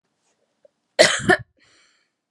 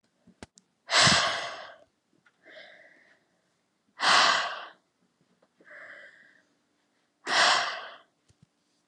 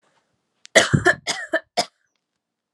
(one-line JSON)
{"cough_length": "2.3 s", "cough_amplitude": 32682, "cough_signal_mean_std_ratio": 0.27, "exhalation_length": "8.9 s", "exhalation_amplitude": 13881, "exhalation_signal_mean_std_ratio": 0.35, "three_cough_length": "2.7 s", "three_cough_amplitude": 32570, "three_cough_signal_mean_std_ratio": 0.32, "survey_phase": "alpha (2021-03-01 to 2021-08-12)", "age": "18-44", "gender": "Female", "wearing_mask": "No", "symptom_cough_any": true, "symptom_fatigue": true, "smoker_status": "Never smoked", "respiratory_condition_asthma": false, "respiratory_condition_other": false, "recruitment_source": "Test and Trace", "submission_delay": "2 days", "covid_test_result": "Positive", "covid_test_method": "RT-qPCR", "covid_ct_value": 31.6, "covid_ct_gene": "N gene", "covid_ct_mean": 32.2, "covid_viral_load": "27 copies/ml", "covid_viral_load_category": "Minimal viral load (< 10K copies/ml)"}